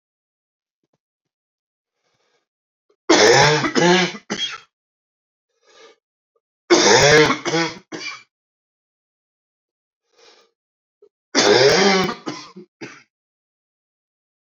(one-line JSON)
{"three_cough_length": "14.5 s", "three_cough_amplitude": 30756, "three_cough_signal_mean_std_ratio": 0.36, "survey_phase": "alpha (2021-03-01 to 2021-08-12)", "age": "45-64", "gender": "Male", "wearing_mask": "No", "symptom_cough_any": true, "symptom_shortness_of_breath": true, "symptom_fatigue": true, "symptom_fever_high_temperature": true, "symptom_headache": true, "symptom_change_to_sense_of_smell_or_taste": true, "symptom_loss_of_taste": true, "smoker_status": "Never smoked", "respiratory_condition_asthma": false, "respiratory_condition_other": false, "recruitment_source": "Test and Trace", "submission_delay": "2 days", "covid_test_result": "Positive", "covid_test_method": "LFT"}